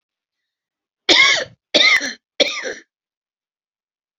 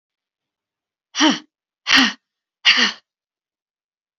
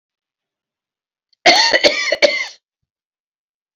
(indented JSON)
{
  "three_cough_length": "4.2 s",
  "three_cough_amplitude": 32158,
  "three_cough_signal_mean_std_ratio": 0.37,
  "exhalation_length": "4.2 s",
  "exhalation_amplitude": 31698,
  "exhalation_signal_mean_std_ratio": 0.32,
  "cough_length": "3.8 s",
  "cough_amplitude": 32767,
  "cough_signal_mean_std_ratio": 0.36,
  "survey_phase": "beta (2021-08-13 to 2022-03-07)",
  "age": "65+",
  "gender": "Female",
  "wearing_mask": "No",
  "symptom_cough_any": true,
  "symptom_runny_or_blocked_nose": true,
  "smoker_status": "Never smoked",
  "respiratory_condition_asthma": true,
  "respiratory_condition_other": false,
  "recruitment_source": "REACT",
  "submission_delay": "1 day",
  "covid_test_result": "Negative",
  "covid_test_method": "RT-qPCR"
}